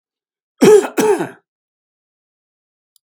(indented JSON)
{
  "cough_length": "3.1 s",
  "cough_amplitude": 32768,
  "cough_signal_mean_std_ratio": 0.32,
  "survey_phase": "beta (2021-08-13 to 2022-03-07)",
  "age": "65+",
  "gender": "Male",
  "wearing_mask": "No",
  "symptom_none": true,
  "smoker_status": "Never smoked",
  "respiratory_condition_asthma": false,
  "respiratory_condition_other": false,
  "recruitment_source": "REACT",
  "submission_delay": "2 days",
  "covid_test_result": "Negative",
  "covid_test_method": "RT-qPCR",
  "influenza_a_test_result": "Negative",
  "influenza_b_test_result": "Negative"
}